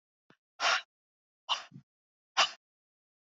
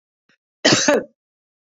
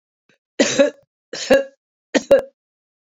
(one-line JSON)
{"exhalation_length": "3.3 s", "exhalation_amplitude": 6993, "exhalation_signal_mean_std_ratio": 0.27, "cough_length": "1.6 s", "cough_amplitude": 27180, "cough_signal_mean_std_ratio": 0.38, "three_cough_length": "3.1 s", "three_cough_amplitude": 30587, "three_cough_signal_mean_std_ratio": 0.36, "survey_phase": "beta (2021-08-13 to 2022-03-07)", "age": "65+", "gender": "Female", "wearing_mask": "No", "symptom_none": true, "smoker_status": "Never smoked", "respiratory_condition_asthma": false, "respiratory_condition_other": false, "recruitment_source": "REACT", "submission_delay": "1 day", "covid_test_result": "Negative", "covid_test_method": "RT-qPCR"}